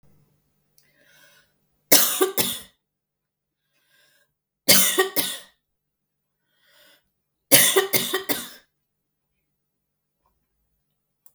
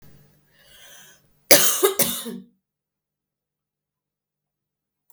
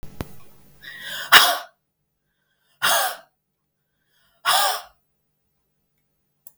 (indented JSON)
{
  "three_cough_length": "11.3 s",
  "three_cough_amplitude": 32768,
  "three_cough_signal_mean_std_ratio": 0.29,
  "cough_length": "5.1 s",
  "cough_amplitude": 32768,
  "cough_signal_mean_std_ratio": 0.25,
  "exhalation_length": "6.6 s",
  "exhalation_amplitude": 32768,
  "exhalation_signal_mean_std_ratio": 0.3,
  "survey_phase": "beta (2021-08-13 to 2022-03-07)",
  "age": "45-64",
  "gender": "Female",
  "wearing_mask": "No",
  "symptom_cough_any": true,
  "symptom_runny_or_blocked_nose": true,
  "symptom_sore_throat": true,
  "symptom_abdominal_pain": true,
  "symptom_fatigue": true,
  "symptom_headache": true,
  "symptom_change_to_sense_of_smell_or_taste": true,
  "symptom_other": true,
  "symptom_onset": "3 days",
  "smoker_status": "Never smoked",
  "respiratory_condition_asthma": false,
  "respiratory_condition_other": false,
  "recruitment_source": "Test and Trace",
  "submission_delay": "2 days",
  "covid_test_result": "Positive",
  "covid_test_method": "RT-qPCR",
  "covid_ct_value": 32.2,
  "covid_ct_gene": "N gene"
}